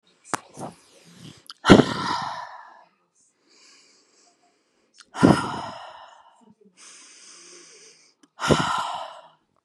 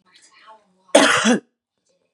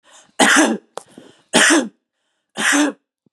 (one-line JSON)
{"exhalation_length": "9.6 s", "exhalation_amplitude": 32768, "exhalation_signal_mean_std_ratio": 0.28, "cough_length": "2.1 s", "cough_amplitude": 32768, "cough_signal_mean_std_ratio": 0.36, "three_cough_length": "3.3 s", "three_cough_amplitude": 32767, "three_cough_signal_mean_std_ratio": 0.47, "survey_phase": "beta (2021-08-13 to 2022-03-07)", "age": "45-64", "gender": "Female", "wearing_mask": "No", "symptom_runny_or_blocked_nose": true, "smoker_status": "Ex-smoker", "respiratory_condition_asthma": false, "respiratory_condition_other": false, "recruitment_source": "REACT", "submission_delay": "2 days", "covid_test_result": "Negative", "covid_test_method": "RT-qPCR", "influenza_a_test_result": "Negative", "influenza_b_test_result": "Negative"}